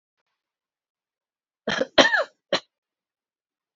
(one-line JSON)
{"cough_length": "3.8 s", "cough_amplitude": 28502, "cough_signal_mean_std_ratio": 0.24, "survey_phase": "beta (2021-08-13 to 2022-03-07)", "age": "18-44", "gender": "Female", "wearing_mask": "No", "symptom_cough_any": true, "symptom_runny_or_blocked_nose": true, "symptom_sore_throat": true, "symptom_fatigue": true, "symptom_change_to_sense_of_smell_or_taste": true, "symptom_onset": "3 days", "smoker_status": "Never smoked", "respiratory_condition_asthma": false, "respiratory_condition_other": false, "recruitment_source": "Test and Trace", "submission_delay": "2 days", "covid_test_result": "Positive", "covid_test_method": "RT-qPCR", "covid_ct_value": 23.3, "covid_ct_gene": "N gene"}